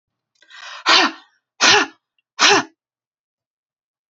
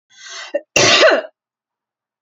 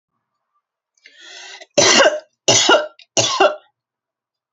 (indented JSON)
{
  "exhalation_length": "4.1 s",
  "exhalation_amplitude": 32768,
  "exhalation_signal_mean_std_ratio": 0.35,
  "cough_length": "2.2 s",
  "cough_amplitude": 32399,
  "cough_signal_mean_std_ratio": 0.42,
  "three_cough_length": "4.5 s",
  "three_cough_amplitude": 32456,
  "three_cough_signal_mean_std_ratio": 0.41,
  "survey_phase": "beta (2021-08-13 to 2022-03-07)",
  "age": "18-44",
  "gender": "Female",
  "wearing_mask": "No",
  "symptom_none": true,
  "smoker_status": "Never smoked",
  "respiratory_condition_asthma": false,
  "respiratory_condition_other": false,
  "recruitment_source": "REACT",
  "submission_delay": "3 days",
  "covid_test_result": "Negative",
  "covid_test_method": "RT-qPCR"
}